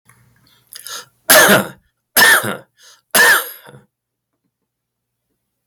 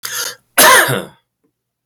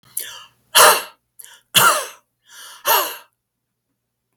{"three_cough_length": "5.7 s", "three_cough_amplitude": 32768, "three_cough_signal_mean_std_ratio": 0.37, "cough_length": "1.9 s", "cough_amplitude": 32768, "cough_signal_mean_std_ratio": 0.46, "exhalation_length": "4.4 s", "exhalation_amplitude": 32768, "exhalation_signal_mean_std_ratio": 0.35, "survey_phase": "beta (2021-08-13 to 2022-03-07)", "age": "45-64", "gender": "Male", "wearing_mask": "No", "symptom_other": true, "smoker_status": "Never smoked", "respiratory_condition_asthma": true, "respiratory_condition_other": false, "recruitment_source": "REACT", "submission_delay": "3 days", "covid_test_result": "Negative", "covid_test_method": "RT-qPCR", "influenza_a_test_result": "Negative", "influenza_b_test_result": "Negative"}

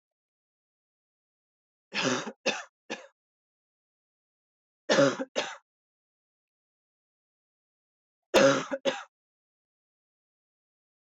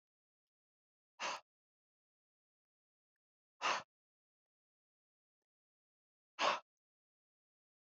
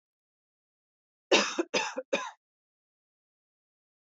{"three_cough_length": "11.1 s", "three_cough_amplitude": 11190, "three_cough_signal_mean_std_ratio": 0.26, "exhalation_length": "7.9 s", "exhalation_amplitude": 2619, "exhalation_signal_mean_std_ratio": 0.2, "cough_length": "4.2 s", "cough_amplitude": 11082, "cough_signal_mean_std_ratio": 0.27, "survey_phase": "beta (2021-08-13 to 2022-03-07)", "age": "18-44", "gender": "Female", "wearing_mask": "No", "symptom_none": true, "smoker_status": "Current smoker (1 to 10 cigarettes per day)", "respiratory_condition_asthma": false, "respiratory_condition_other": false, "recruitment_source": "REACT", "submission_delay": "1 day", "covid_test_result": "Negative", "covid_test_method": "RT-qPCR"}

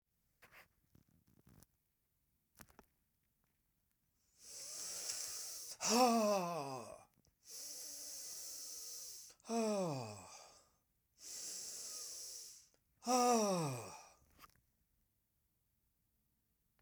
{"exhalation_length": "16.8 s", "exhalation_amplitude": 2985, "exhalation_signal_mean_std_ratio": 0.43, "survey_phase": "beta (2021-08-13 to 2022-03-07)", "age": "65+", "gender": "Male", "wearing_mask": "No", "symptom_none": true, "smoker_status": "Never smoked", "respiratory_condition_asthma": false, "respiratory_condition_other": false, "recruitment_source": "REACT", "submission_delay": "3 days", "covid_test_result": "Negative", "covid_test_method": "RT-qPCR", "influenza_a_test_result": "Negative", "influenza_b_test_result": "Negative"}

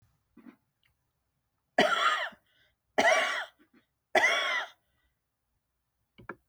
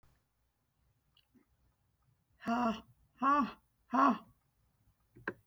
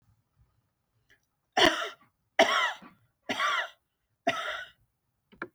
{"three_cough_length": "6.5 s", "three_cough_amplitude": 10541, "three_cough_signal_mean_std_ratio": 0.38, "exhalation_length": "5.5 s", "exhalation_amplitude": 4737, "exhalation_signal_mean_std_ratio": 0.33, "cough_length": "5.5 s", "cough_amplitude": 17076, "cough_signal_mean_std_ratio": 0.35, "survey_phase": "beta (2021-08-13 to 2022-03-07)", "age": "65+", "gender": "Male", "wearing_mask": "No", "symptom_none": true, "smoker_status": "Never smoked", "respiratory_condition_asthma": false, "respiratory_condition_other": false, "recruitment_source": "REACT", "submission_delay": "1 day", "covid_test_result": "Negative", "covid_test_method": "RT-qPCR", "influenza_a_test_result": "Negative", "influenza_b_test_result": "Negative"}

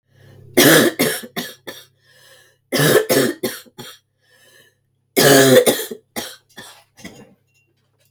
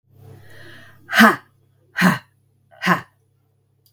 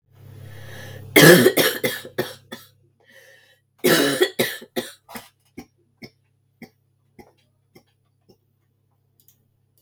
{"three_cough_length": "8.1 s", "three_cough_amplitude": 32768, "three_cough_signal_mean_std_ratio": 0.41, "exhalation_length": "3.9 s", "exhalation_amplitude": 32768, "exhalation_signal_mean_std_ratio": 0.31, "cough_length": "9.8 s", "cough_amplitude": 32768, "cough_signal_mean_std_ratio": 0.29, "survey_phase": "beta (2021-08-13 to 2022-03-07)", "age": "45-64", "gender": "Female", "wearing_mask": "No", "symptom_cough_any": true, "symptom_runny_or_blocked_nose": true, "symptom_sore_throat": true, "symptom_fever_high_temperature": true, "symptom_headache": true, "symptom_other": true, "symptom_onset": "3 days", "smoker_status": "Never smoked", "respiratory_condition_asthma": false, "respiratory_condition_other": false, "recruitment_source": "REACT", "submission_delay": "2 days", "covid_test_result": "Positive", "covid_test_method": "RT-qPCR", "covid_ct_value": 24.0, "covid_ct_gene": "E gene", "influenza_a_test_result": "Negative", "influenza_b_test_result": "Negative"}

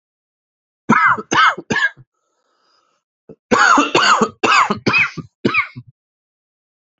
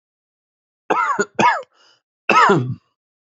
{"cough_length": "7.0 s", "cough_amplitude": 32767, "cough_signal_mean_std_ratio": 0.47, "three_cough_length": "3.2 s", "three_cough_amplitude": 28472, "three_cough_signal_mean_std_ratio": 0.44, "survey_phase": "alpha (2021-03-01 to 2021-08-12)", "age": "18-44", "gender": "Male", "wearing_mask": "No", "symptom_new_continuous_cough": true, "symptom_abdominal_pain": true, "symptom_diarrhoea": true, "symptom_fever_high_temperature": true, "symptom_headache": true, "symptom_onset": "3 days", "smoker_status": "Never smoked", "respiratory_condition_asthma": false, "respiratory_condition_other": false, "recruitment_source": "Test and Trace", "submission_delay": "2 days", "covid_test_result": "Positive", "covid_test_method": "RT-qPCR", "covid_ct_value": 20.2, "covid_ct_gene": "N gene", "covid_ct_mean": 20.4, "covid_viral_load": "210000 copies/ml", "covid_viral_load_category": "Low viral load (10K-1M copies/ml)"}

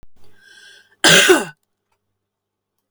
{"cough_length": "2.9 s", "cough_amplitude": 32486, "cough_signal_mean_std_ratio": 0.32, "survey_phase": "beta (2021-08-13 to 2022-03-07)", "age": "45-64", "gender": "Female", "wearing_mask": "No", "symptom_abdominal_pain": true, "symptom_onset": "12 days", "smoker_status": "Ex-smoker", "respiratory_condition_asthma": false, "respiratory_condition_other": true, "recruitment_source": "REACT", "submission_delay": "1 day", "covid_test_result": "Negative", "covid_test_method": "RT-qPCR"}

